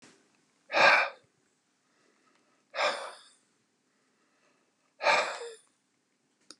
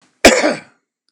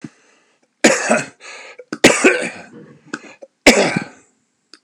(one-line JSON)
{"exhalation_length": "6.6 s", "exhalation_amplitude": 12189, "exhalation_signal_mean_std_ratio": 0.29, "cough_length": "1.1 s", "cough_amplitude": 32768, "cough_signal_mean_std_ratio": 0.39, "three_cough_length": "4.8 s", "three_cough_amplitude": 32768, "three_cough_signal_mean_std_ratio": 0.38, "survey_phase": "beta (2021-08-13 to 2022-03-07)", "age": "65+", "gender": "Male", "wearing_mask": "No", "symptom_cough_any": true, "symptom_shortness_of_breath": true, "symptom_fatigue": true, "symptom_onset": "12 days", "smoker_status": "Ex-smoker", "respiratory_condition_asthma": true, "respiratory_condition_other": false, "recruitment_source": "REACT", "submission_delay": "3 days", "covid_test_result": "Negative", "covid_test_method": "RT-qPCR", "influenza_a_test_result": "Negative", "influenza_b_test_result": "Negative"}